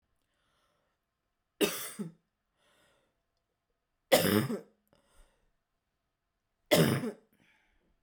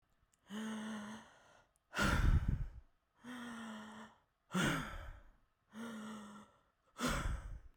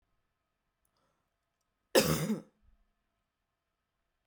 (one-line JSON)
{"three_cough_length": "8.0 s", "three_cough_amplitude": 12471, "three_cough_signal_mean_std_ratio": 0.27, "exhalation_length": "7.8 s", "exhalation_amplitude": 3311, "exhalation_signal_mean_std_ratio": 0.51, "cough_length": "4.3 s", "cough_amplitude": 9731, "cough_signal_mean_std_ratio": 0.23, "survey_phase": "beta (2021-08-13 to 2022-03-07)", "age": "18-44", "gender": "Female", "wearing_mask": "No", "symptom_none": true, "smoker_status": "Never smoked", "respiratory_condition_asthma": false, "respiratory_condition_other": false, "recruitment_source": "REACT", "submission_delay": "2 days", "covid_test_result": "Negative", "covid_test_method": "RT-qPCR"}